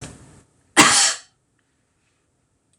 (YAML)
cough_length: 2.8 s
cough_amplitude: 26028
cough_signal_mean_std_ratio: 0.3
survey_phase: beta (2021-08-13 to 2022-03-07)
age: 45-64
gender: Female
wearing_mask: 'No'
symptom_none: true
smoker_status: Never smoked
respiratory_condition_asthma: false
respiratory_condition_other: false
recruitment_source: REACT
submission_delay: 1 day
covid_test_result: Negative
covid_test_method: RT-qPCR
influenza_a_test_result: Negative
influenza_b_test_result: Negative